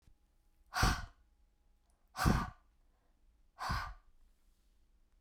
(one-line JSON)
{"exhalation_length": "5.2 s", "exhalation_amplitude": 6165, "exhalation_signal_mean_std_ratio": 0.33, "survey_phase": "beta (2021-08-13 to 2022-03-07)", "age": "45-64", "gender": "Female", "wearing_mask": "No", "symptom_none": true, "smoker_status": "Never smoked", "respiratory_condition_asthma": false, "respiratory_condition_other": false, "recruitment_source": "REACT", "submission_delay": "1 day", "covid_test_result": "Negative", "covid_test_method": "RT-qPCR"}